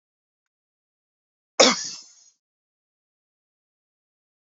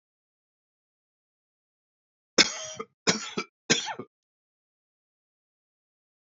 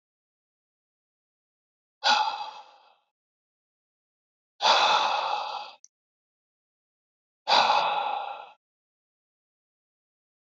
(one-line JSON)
{"cough_length": "4.5 s", "cough_amplitude": 28525, "cough_signal_mean_std_ratio": 0.16, "three_cough_length": "6.4 s", "three_cough_amplitude": 22632, "three_cough_signal_mean_std_ratio": 0.21, "exhalation_length": "10.6 s", "exhalation_amplitude": 13973, "exhalation_signal_mean_std_ratio": 0.36, "survey_phase": "beta (2021-08-13 to 2022-03-07)", "age": "45-64", "gender": "Male", "wearing_mask": "No", "symptom_none": true, "smoker_status": "Current smoker (11 or more cigarettes per day)", "respiratory_condition_asthma": false, "respiratory_condition_other": false, "recruitment_source": "REACT", "submission_delay": "1 day", "covid_test_result": "Negative", "covid_test_method": "RT-qPCR"}